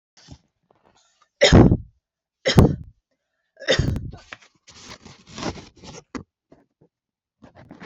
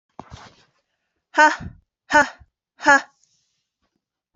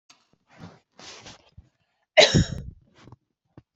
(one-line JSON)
{"three_cough_length": "7.9 s", "three_cough_amplitude": 28991, "three_cough_signal_mean_std_ratio": 0.28, "exhalation_length": "4.4 s", "exhalation_amplitude": 28873, "exhalation_signal_mean_std_ratio": 0.26, "cough_length": "3.8 s", "cough_amplitude": 26114, "cough_signal_mean_std_ratio": 0.24, "survey_phase": "beta (2021-08-13 to 2022-03-07)", "age": "18-44", "gender": "Female", "wearing_mask": "No", "symptom_sore_throat": true, "symptom_fatigue": true, "symptom_headache": true, "smoker_status": "Never smoked", "respiratory_condition_asthma": false, "respiratory_condition_other": false, "recruitment_source": "Test and Trace", "submission_delay": "3 days", "covid_test_result": "Positive", "covid_test_method": "RT-qPCR", "covid_ct_value": 38.6, "covid_ct_gene": "N gene"}